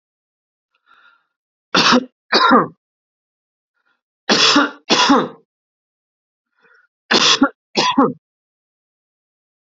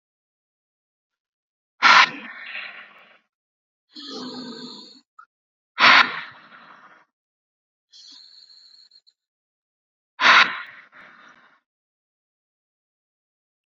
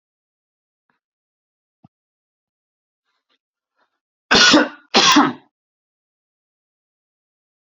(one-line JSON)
{"three_cough_length": "9.6 s", "three_cough_amplitude": 32522, "three_cough_signal_mean_std_ratio": 0.37, "exhalation_length": "13.7 s", "exhalation_amplitude": 30341, "exhalation_signal_mean_std_ratio": 0.23, "cough_length": "7.7 s", "cough_amplitude": 32767, "cough_signal_mean_std_ratio": 0.25, "survey_phase": "beta (2021-08-13 to 2022-03-07)", "age": "45-64", "gender": "Male", "wearing_mask": "No", "symptom_none": true, "smoker_status": "Never smoked", "respiratory_condition_asthma": false, "respiratory_condition_other": false, "recruitment_source": "Test and Trace", "submission_delay": "1 day", "covid_test_result": "Negative", "covid_test_method": "LFT"}